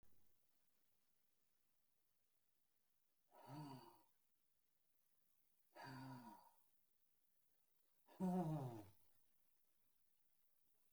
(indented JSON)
{
  "exhalation_length": "10.9 s",
  "exhalation_amplitude": 597,
  "exhalation_signal_mean_std_ratio": 0.33,
  "survey_phase": "beta (2021-08-13 to 2022-03-07)",
  "age": "65+",
  "gender": "Male",
  "wearing_mask": "No",
  "symptom_none": true,
  "smoker_status": "Ex-smoker",
  "respiratory_condition_asthma": false,
  "respiratory_condition_other": false,
  "recruitment_source": "REACT",
  "submission_delay": "1 day",
  "covid_test_result": "Negative",
  "covid_test_method": "RT-qPCR"
}